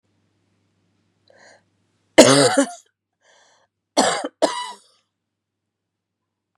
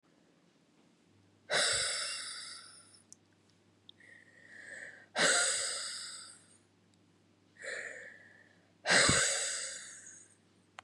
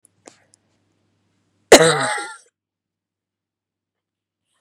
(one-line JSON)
{"three_cough_length": "6.6 s", "three_cough_amplitude": 32768, "three_cough_signal_mean_std_ratio": 0.26, "exhalation_length": "10.8 s", "exhalation_amplitude": 7114, "exhalation_signal_mean_std_ratio": 0.43, "cough_length": "4.6 s", "cough_amplitude": 32768, "cough_signal_mean_std_ratio": 0.21, "survey_phase": "beta (2021-08-13 to 2022-03-07)", "age": "18-44", "gender": "Female", "wearing_mask": "No", "symptom_cough_any": true, "symptom_new_continuous_cough": true, "symptom_runny_or_blocked_nose": true, "symptom_shortness_of_breath": true, "symptom_sore_throat": true, "symptom_fatigue": true, "symptom_fever_high_temperature": true, "symptom_headache": true, "symptom_other": true, "symptom_onset": "3 days", "smoker_status": "Never smoked", "respiratory_condition_asthma": false, "respiratory_condition_other": true, "recruitment_source": "Test and Trace", "submission_delay": "2 days", "covid_test_result": "Positive", "covid_test_method": "RT-qPCR", "covid_ct_value": 22.2, "covid_ct_gene": "N gene"}